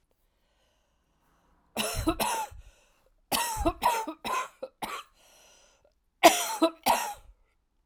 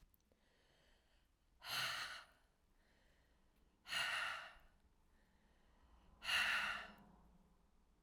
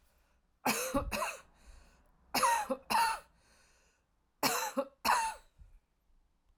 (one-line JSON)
{"cough_length": "7.9 s", "cough_amplitude": 20909, "cough_signal_mean_std_ratio": 0.39, "exhalation_length": "8.0 s", "exhalation_amplitude": 1576, "exhalation_signal_mean_std_ratio": 0.41, "three_cough_length": "6.6 s", "three_cough_amplitude": 5088, "three_cough_signal_mean_std_ratio": 0.46, "survey_phase": "alpha (2021-03-01 to 2021-08-12)", "age": "45-64", "gender": "Female", "wearing_mask": "No", "symptom_cough_any": true, "symptom_fatigue": true, "symptom_fever_high_temperature": true, "symptom_headache": true, "symptom_change_to_sense_of_smell_or_taste": true, "symptom_onset": "5 days", "smoker_status": "Never smoked", "respiratory_condition_asthma": false, "respiratory_condition_other": false, "recruitment_source": "Test and Trace", "submission_delay": "2 days", "covid_test_result": "Positive", "covid_test_method": "RT-qPCR", "covid_ct_value": 18.3, "covid_ct_gene": "ORF1ab gene"}